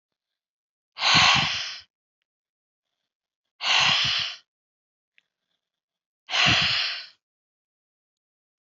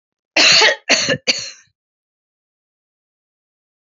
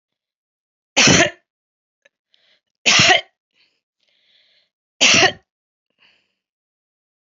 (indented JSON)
{
  "exhalation_length": "8.6 s",
  "exhalation_amplitude": 20146,
  "exhalation_signal_mean_std_ratio": 0.39,
  "cough_length": "3.9 s",
  "cough_amplitude": 32768,
  "cough_signal_mean_std_ratio": 0.35,
  "three_cough_length": "7.3 s",
  "three_cough_amplitude": 30993,
  "three_cough_signal_mean_std_ratio": 0.29,
  "survey_phase": "alpha (2021-03-01 to 2021-08-12)",
  "age": "65+",
  "gender": "Female",
  "wearing_mask": "No",
  "symptom_headache": true,
  "smoker_status": "Never smoked",
  "respiratory_condition_asthma": false,
  "respiratory_condition_other": false,
  "recruitment_source": "REACT",
  "submission_delay": "2 days",
  "covid_test_result": "Negative",
  "covid_test_method": "RT-qPCR"
}